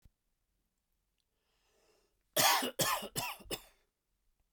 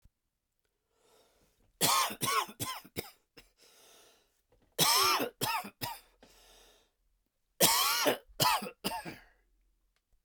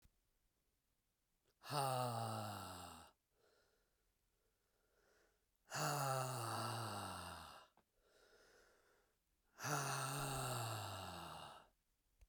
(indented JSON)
{
  "cough_length": "4.5 s",
  "cough_amplitude": 7254,
  "cough_signal_mean_std_ratio": 0.33,
  "three_cough_length": "10.2 s",
  "three_cough_amplitude": 12234,
  "three_cough_signal_mean_std_ratio": 0.41,
  "exhalation_length": "12.3 s",
  "exhalation_amplitude": 1520,
  "exhalation_signal_mean_std_ratio": 0.54,
  "survey_phase": "beta (2021-08-13 to 2022-03-07)",
  "age": "45-64",
  "gender": "Male",
  "wearing_mask": "No",
  "symptom_cough_any": true,
  "symptom_runny_or_blocked_nose": true,
  "symptom_onset": "12 days",
  "smoker_status": "Ex-smoker",
  "respiratory_condition_asthma": false,
  "respiratory_condition_other": false,
  "recruitment_source": "REACT",
  "submission_delay": "1 day",
  "covid_test_result": "Negative",
  "covid_test_method": "RT-qPCR"
}